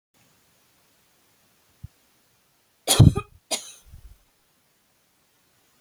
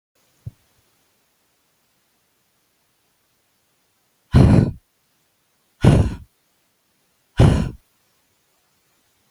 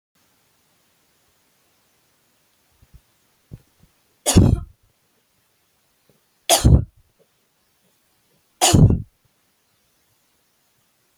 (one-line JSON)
{"cough_length": "5.8 s", "cough_amplitude": 26742, "cough_signal_mean_std_ratio": 0.17, "exhalation_length": "9.3 s", "exhalation_amplitude": 27038, "exhalation_signal_mean_std_ratio": 0.25, "three_cough_length": "11.2 s", "three_cough_amplitude": 32767, "three_cough_signal_mean_std_ratio": 0.23, "survey_phase": "alpha (2021-03-01 to 2021-08-12)", "age": "65+", "gender": "Female", "wearing_mask": "No", "symptom_none": true, "smoker_status": "Ex-smoker", "respiratory_condition_asthma": false, "respiratory_condition_other": false, "recruitment_source": "REACT", "submission_delay": "1 day", "covid_test_result": "Negative", "covid_test_method": "RT-qPCR"}